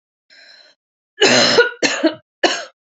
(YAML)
cough_length: 2.9 s
cough_amplitude: 31991
cough_signal_mean_std_ratio: 0.46
survey_phase: beta (2021-08-13 to 2022-03-07)
age: 18-44
gender: Female
wearing_mask: 'No'
symptom_cough_any: true
symptom_shortness_of_breath: true
symptom_sore_throat: true
symptom_fatigue: true
smoker_status: Current smoker (e-cigarettes or vapes only)
respiratory_condition_asthma: false
respiratory_condition_other: false
recruitment_source: Test and Trace
submission_delay: 1 day
covid_test_result: Positive
covid_test_method: RT-qPCR
covid_ct_value: 21.4
covid_ct_gene: N gene
covid_ct_mean: 22.3
covid_viral_load: 50000 copies/ml
covid_viral_load_category: Low viral load (10K-1M copies/ml)